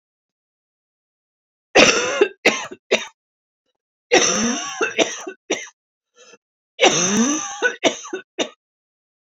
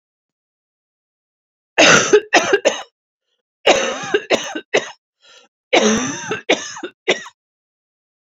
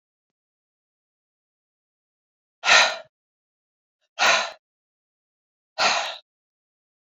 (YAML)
three_cough_length: 9.3 s
three_cough_amplitude: 32767
three_cough_signal_mean_std_ratio: 0.42
cough_length: 8.4 s
cough_amplitude: 30449
cough_signal_mean_std_ratio: 0.4
exhalation_length: 7.1 s
exhalation_amplitude: 25400
exhalation_signal_mean_std_ratio: 0.26
survey_phase: beta (2021-08-13 to 2022-03-07)
age: 45-64
gender: Female
wearing_mask: 'No'
symptom_cough_any: true
symptom_headache: true
symptom_change_to_sense_of_smell_or_taste: true
symptom_other: true
symptom_onset: 3 days
smoker_status: Never smoked
respiratory_condition_asthma: false
respiratory_condition_other: false
recruitment_source: Test and Trace
submission_delay: 2 days
covid_test_result: Positive
covid_test_method: ePCR